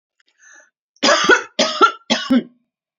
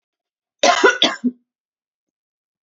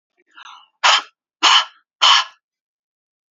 {"three_cough_length": "3.0 s", "three_cough_amplitude": 32767, "three_cough_signal_mean_std_ratio": 0.44, "cough_length": "2.6 s", "cough_amplitude": 29959, "cough_signal_mean_std_ratio": 0.33, "exhalation_length": "3.3 s", "exhalation_amplitude": 32767, "exhalation_signal_mean_std_ratio": 0.35, "survey_phase": "beta (2021-08-13 to 2022-03-07)", "age": "45-64", "gender": "Female", "wearing_mask": "No", "symptom_none": true, "smoker_status": "Never smoked", "respiratory_condition_asthma": false, "respiratory_condition_other": false, "recruitment_source": "REACT", "submission_delay": "6 days", "covid_test_result": "Negative", "covid_test_method": "RT-qPCR"}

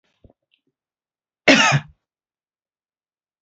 {"cough_length": "3.4 s", "cough_amplitude": 31888, "cough_signal_mean_std_ratio": 0.24, "survey_phase": "beta (2021-08-13 to 2022-03-07)", "age": "65+", "gender": "Female", "wearing_mask": "No", "symptom_cough_any": true, "smoker_status": "Ex-smoker", "respiratory_condition_asthma": true, "respiratory_condition_other": false, "recruitment_source": "REACT", "submission_delay": "1 day", "covid_test_result": "Negative", "covid_test_method": "RT-qPCR", "influenza_a_test_result": "Negative", "influenza_b_test_result": "Negative"}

